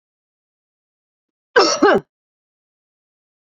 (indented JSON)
{
  "cough_length": "3.4 s",
  "cough_amplitude": 29335,
  "cough_signal_mean_std_ratio": 0.26,
  "survey_phase": "beta (2021-08-13 to 2022-03-07)",
  "age": "65+",
  "gender": "Female",
  "wearing_mask": "No",
  "symptom_none": true,
  "symptom_onset": "11 days",
  "smoker_status": "Ex-smoker",
  "respiratory_condition_asthma": false,
  "respiratory_condition_other": false,
  "recruitment_source": "REACT",
  "submission_delay": "2 days",
  "covid_test_result": "Negative",
  "covid_test_method": "RT-qPCR",
  "covid_ct_value": 38.0,
  "covid_ct_gene": "N gene",
  "influenza_a_test_result": "Negative",
  "influenza_b_test_result": "Negative"
}